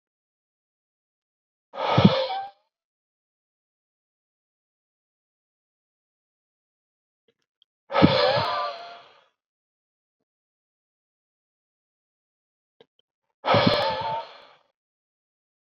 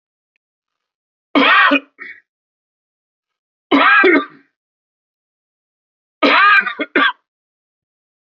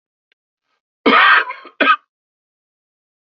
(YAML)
exhalation_length: 15.7 s
exhalation_amplitude: 28462
exhalation_signal_mean_std_ratio: 0.27
three_cough_length: 8.4 s
three_cough_amplitude: 32047
three_cough_signal_mean_std_ratio: 0.37
cough_length: 3.2 s
cough_amplitude: 30364
cough_signal_mean_std_ratio: 0.35
survey_phase: beta (2021-08-13 to 2022-03-07)
age: 18-44
gender: Male
wearing_mask: 'No'
symptom_shortness_of_breath: true
symptom_fatigue: true
symptom_onset: 13 days
smoker_status: Never smoked
respiratory_condition_asthma: false
respiratory_condition_other: false
recruitment_source: REACT
submission_delay: 4 days
covid_test_result: Negative
covid_test_method: RT-qPCR